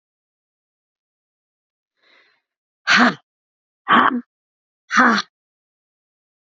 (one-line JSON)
{"exhalation_length": "6.5 s", "exhalation_amplitude": 32767, "exhalation_signal_mean_std_ratio": 0.28, "survey_phase": "beta (2021-08-13 to 2022-03-07)", "age": "18-44", "gender": "Female", "wearing_mask": "No", "symptom_cough_any": true, "symptom_runny_or_blocked_nose": true, "symptom_sore_throat": true, "symptom_fatigue": true, "symptom_headache": true, "symptom_change_to_sense_of_smell_or_taste": true, "symptom_loss_of_taste": true, "symptom_onset": "2 days", "smoker_status": "Ex-smoker", "respiratory_condition_asthma": false, "respiratory_condition_other": false, "recruitment_source": "Test and Trace", "submission_delay": "1 day", "covid_test_result": "Positive", "covid_test_method": "RT-qPCR", "covid_ct_value": 21.2, "covid_ct_gene": "ORF1ab gene"}